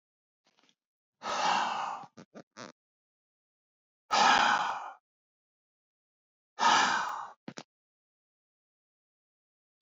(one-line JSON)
{"exhalation_length": "9.8 s", "exhalation_amplitude": 8769, "exhalation_signal_mean_std_ratio": 0.35, "survey_phase": "beta (2021-08-13 to 2022-03-07)", "age": "45-64", "gender": "Male", "wearing_mask": "No", "symptom_none": true, "smoker_status": "Never smoked", "respiratory_condition_asthma": false, "respiratory_condition_other": false, "recruitment_source": "REACT", "submission_delay": "0 days", "covid_test_result": "Negative", "covid_test_method": "RT-qPCR", "influenza_a_test_result": "Negative", "influenza_b_test_result": "Negative"}